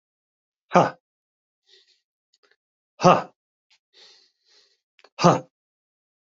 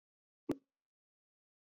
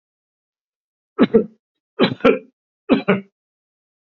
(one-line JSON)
{"exhalation_length": "6.4 s", "exhalation_amplitude": 32768, "exhalation_signal_mean_std_ratio": 0.2, "cough_length": "1.6 s", "cough_amplitude": 1726, "cough_signal_mean_std_ratio": 0.14, "three_cough_length": "4.0 s", "three_cough_amplitude": 32767, "three_cough_signal_mean_std_ratio": 0.31, "survey_phase": "beta (2021-08-13 to 2022-03-07)", "age": "65+", "gender": "Male", "wearing_mask": "No", "symptom_none": true, "smoker_status": "Ex-smoker", "respiratory_condition_asthma": false, "respiratory_condition_other": false, "recruitment_source": "REACT", "submission_delay": "1 day", "covid_test_result": "Negative", "covid_test_method": "RT-qPCR"}